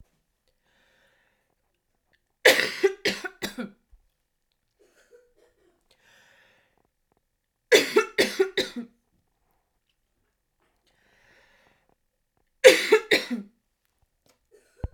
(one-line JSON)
{"three_cough_length": "14.9 s", "three_cough_amplitude": 32768, "three_cough_signal_mean_std_ratio": 0.23, "survey_phase": "beta (2021-08-13 to 2022-03-07)", "age": "18-44", "gender": "Female", "wearing_mask": "No", "symptom_cough_any": true, "symptom_runny_or_blocked_nose": true, "symptom_sore_throat": true, "symptom_fatigue": true, "symptom_headache": true, "symptom_loss_of_taste": true, "symptom_onset": "2 days", "smoker_status": "Never smoked", "respiratory_condition_asthma": false, "respiratory_condition_other": false, "recruitment_source": "Test and Trace", "submission_delay": "2 days", "covid_test_result": "Positive", "covid_test_method": "RT-qPCR"}